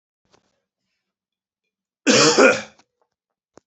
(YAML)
cough_length: 3.7 s
cough_amplitude: 27236
cough_signal_mean_std_ratio: 0.3
survey_phase: beta (2021-08-13 to 2022-03-07)
age: 45-64
gender: Male
wearing_mask: 'No'
symptom_cough_any: true
symptom_new_continuous_cough: true
symptom_runny_or_blocked_nose: true
symptom_fatigue: true
symptom_onset: 5 days
smoker_status: Never smoked
respiratory_condition_asthma: false
respiratory_condition_other: false
recruitment_source: Test and Trace
submission_delay: 2 days
covid_test_result: Positive
covid_test_method: RT-qPCR
covid_ct_value: 24.2
covid_ct_gene: N gene